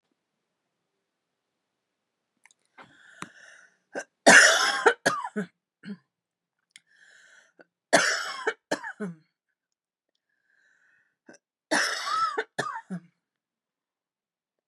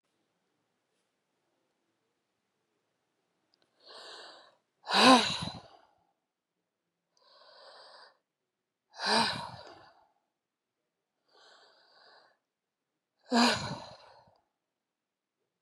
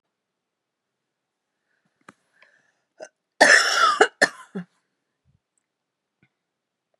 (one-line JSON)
{"three_cough_length": "14.7 s", "three_cough_amplitude": 28436, "three_cough_signal_mean_std_ratio": 0.27, "exhalation_length": "15.6 s", "exhalation_amplitude": 12709, "exhalation_signal_mean_std_ratio": 0.23, "cough_length": "7.0 s", "cough_amplitude": 31646, "cough_signal_mean_std_ratio": 0.24, "survey_phase": "beta (2021-08-13 to 2022-03-07)", "age": "45-64", "gender": "Female", "wearing_mask": "No", "symptom_none": true, "smoker_status": "Never smoked", "respiratory_condition_asthma": false, "respiratory_condition_other": false, "recruitment_source": "REACT", "submission_delay": "1 day", "covid_test_result": "Negative", "covid_test_method": "RT-qPCR", "influenza_a_test_result": "Negative", "influenza_b_test_result": "Negative"}